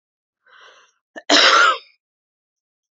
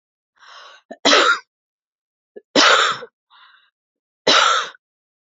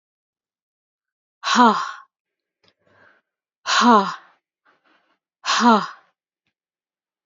{"cough_length": "2.9 s", "cough_amplitude": 32767, "cough_signal_mean_std_ratio": 0.34, "three_cough_length": "5.4 s", "three_cough_amplitude": 29466, "three_cough_signal_mean_std_ratio": 0.38, "exhalation_length": "7.3 s", "exhalation_amplitude": 27203, "exhalation_signal_mean_std_ratio": 0.31, "survey_phase": "beta (2021-08-13 to 2022-03-07)", "age": "18-44", "gender": "Female", "wearing_mask": "No", "symptom_runny_or_blocked_nose": true, "smoker_status": "Never smoked", "respiratory_condition_asthma": false, "respiratory_condition_other": false, "recruitment_source": "Test and Trace", "submission_delay": "2 days", "covid_test_result": "Positive", "covid_test_method": "RT-qPCR"}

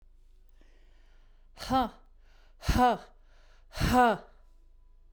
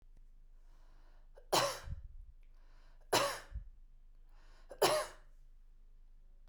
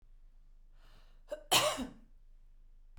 {"exhalation_length": "5.1 s", "exhalation_amplitude": 8579, "exhalation_signal_mean_std_ratio": 0.38, "three_cough_length": "6.5 s", "three_cough_amplitude": 6191, "three_cough_signal_mean_std_ratio": 0.42, "cough_length": "3.0 s", "cough_amplitude": 6633, "cough_signal_mean_std_ratio": 0.37, "survey_phase": "beta (2021-08-13 to 2022-03-07)", "age": "65+", "gender": "Female", "wearing_mask": "No", "symptom_none": true, "smoker_status": "Ex-smoker", "respiratory_condition_asthma": false, "respiratory_condition_other": false, "recruitment_source": "REACT", "submission_delay": "1 day", "covid_test_result": "Negative", "covid_test_method": "RT-qPCR"}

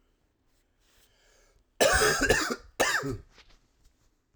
{"cough_length": "4.4 s", "cough_amplitude": 13660, "cough_signal_mean_std_ratio": 0.41, "survey_phase": "alpha (2021-03-01 to 2021-08-12)", "age": "18-44", "gender": "Male", "wearing_mask": "No", "symptom_cough_any": true, "symptom_new_continuous_cough": true, "symptom_fatigue": true, "symptom_onset": "2 days", "smoker_status": "Current smoker (1 to 10 cigarettes per day)", "respiratory_condition_asthma": false, "respiratory_condition_other": false, "recruitment_source": "Test and Trace", "submission_delay": "1 day", "covid_test_result": "Positive", "covid_test_method": "RT-qPCR", "covid_ct_value": 30.7, "covid_ct_gene": "N gene"}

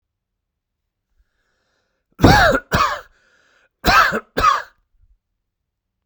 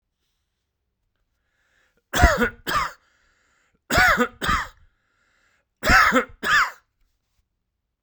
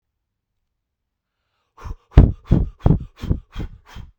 {"cough_length": "6.1 s", "cough_amplitude": 32768, "cough_signal_mean_std_ratio": 0.35, "three_cough_length": "8.0 s", "three_cough_amplitude": 32524, "three_cough_signal_mean_std_ratio": 0.37, "exhalation_length": "4.2 s", "exhalation_amplitude": 32768, "exhalation_signal_mean_std_ratio": 0.28, "survey_phase": "beta (2021-08-13 to 2022-03-07)", "age": "45-64", "gender": "Male", "wearing_mask": "No", "symptom_none": true, "smoker_status": "Ex-smoker", "respiratory_condition_asthma": false, "respiratory_condition_other": false, "recruitment_source": "REACT", "submission_delay": "5 days", "covid_test_result": "Negative", "covid_test_method": "RT-qPCR", "influenza_a_test_result": "Negative", "influenza_b_test_result": "Negative"}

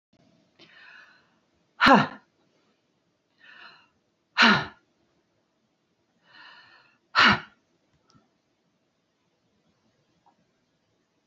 {"exhalation_length": "11.3 s", "exhalation_amplitude": 23140, "exhalation_signal_mean_std_ratio": 0.21, "survey_phase": "beta (2021-08-13 to 2022-03-07)", "age": "45-64", "gender": "Female", "wearing_mask": "No", "symptom_none": true, "smoker_status": "Never smoked", "respiratory_condition_asthma": false, "respiratory_condition_other": false, "recruitment_source": "REACT", "submission_delay": "2 days", "covid_test_result": "Negative", "covid_test_method": "RT-qPCR"}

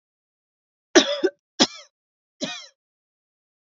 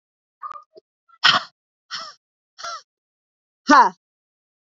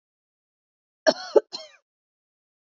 {"three_cough_length": "3.8 s", "three_cough_amplitude": 32768, "three_cough_signal_mean_std_ratio": 0.23, "exhalation_length": "4.6 s", "exhalation_amplitude": 32768, "exhalation_signal_mean_std_ratio": 0.25, "cough_length": "2.6 s", "cough_amplitude": 22235, "cough_signal_mean_std_ratio": 0.17, "survey_phase": "beta (2021-08-13 to 2022-03-07)", "age": "18-44", "gender": "Female", "wearing_mask": "No", "symptom_none": true, "smoker_status": "Never smoked", "respiratory_condition_asthma": false, "respiratory_condition_other": false, "recruitment_source": "REACT", "submission_delay": "1 day", "covid_test_result": "Negative", "covid_test_method": "RT-qPCR", "influenza_a_test_result": "Negative", "influenza_b_test_result": "Negative"}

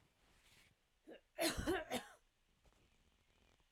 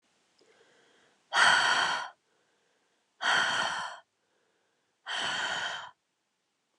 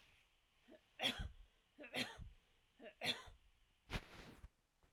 {"cough_length": "3.7 s", "cough_amplitude": 2090, "cough_signal_mean_std_ratio": 0.35, "exhalation_length": "6.8 s", "exhalation_amplitude": 10688, "exhalation_signal_mean_std_ratio": 0.44, "three_cough_length": "4.9 s", "three_cough_amplitude": 1552, "three_cough_signal_mean_std_ratio": 0.4, "survey_phase": "alpha (2021-03-01 to 2021-08-12)", "age": "18-44", "gender": "Female", "wearing_mask": "No", "symptom_none": true, "smoker_status": "Never smoked", "respiratory_condition_asthma": false, "respiratory_condition_other": false, "recruitment_source": "REACT", "submission_delay": "1 day", "covid_test_result": "Negative", "covid_test_method": "RT-qPCR"}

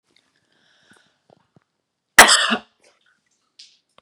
{"cough_length": "4.0 s", "cough_amplitude": 32768, "cough_signal_mean_std_ratio": 0.2, "survey_phase": "beta (2021-08-13 to 2022-03-07)", "age": "45-64", "gender": "Female", "wearing_mask": "No", "symptom_none": true, "smoker_status": "Never smoked", "respiratory_condition_asthma": false, "respiratory_condition_other": false, "recruitment_source": "REACT", "submission_delay": "3 days", "covid_test_result": "Negative", "covid_test_method": "RT-qPCR", "influenza_a_test_result": "Negative", "influenza_b_test_result": "Negative"}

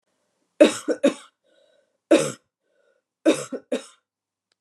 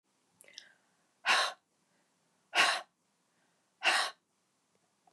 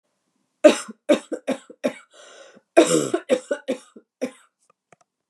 {"three_cough_length": "4.6 s", "three_cough_amplitude": 29641, "three_cough_signal_mean_std_ratio": 0.28, "exhalation_length": "5.1 s", "exhalation_amplitude": 8329, "exhalation_signal_mean_std_ratio": 0.31, "cough_length": "5.3 s", "cough_amplitude": 32196, "cough_signal_mean_std_ratio": 0.31, "survey_phase": "beta (2021-08-13 to 2022-03-07)", "age": "45-64", "gender": "Female", "wearing_mask": "No", "symptom_none": true, "smoker_status": "Never smoked", "respiratory_condition_asthma": false, "respiratory_condition_other": false, "recruitment_source": "REACT", "submission_delay": "1 day", "covid_test_result": "Negative", "covid_test_method": "RT-qPCR", "influenza_a_test_result": "Unknown/Void", "influenza_b_test_result": "Unknown/Void"}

